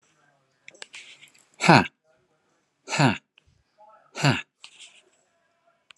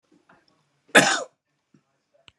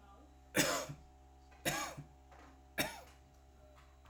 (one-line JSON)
{"exhalation_length": "6.0 s", "exhalation_amplitude": 32123, "exhalation_signal_mean_std_ratio": 0.23, "cough_length": "2.4 s", "cough_amplitude": 32632, "cough_signal_mean_std_ratio": 0.23, "three_cough_length": "4.1 s", "three_cough_amplitude": 4797, "three_cough_signal_mean_std_ratio": 0.43, "survey_phase": "alpha (2021-03-01 to 2021-08-12)", "age": "45-64", "gender": "Male", "wearing_mask": "No", "symptom_cough_any": true, "smoker_status": "Ex-smoker", "respiratory_condition_asthma": false, "respiratory_condition_other": false, "recruitment_source": "REACT", "submission_delay": "3 days", "covid_test_result": "Negative", "covid_test_method": "RT-qPCR"}